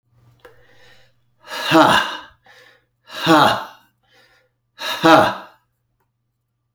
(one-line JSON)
{"exhalation_length": "6.7 s", "exhalation_amplitude": 32743, "exhalation_signal_mean_std_ratio": 0.35, "survey_phase": "alpha (2021-03-01 to 2021-08-12)", "age": "45-64", "gender": "Male", "wearing_mask": "No", "symptom_none": true, "smoker_status": "Never smoked", "respiratory_condition_asthma": false, "respiratory_condition_other": false, "recruitment_source": "REACT", "submission_delay": "1 day", "covid_test_result": "Negative", "covid_test_method": "RT-qPCR"}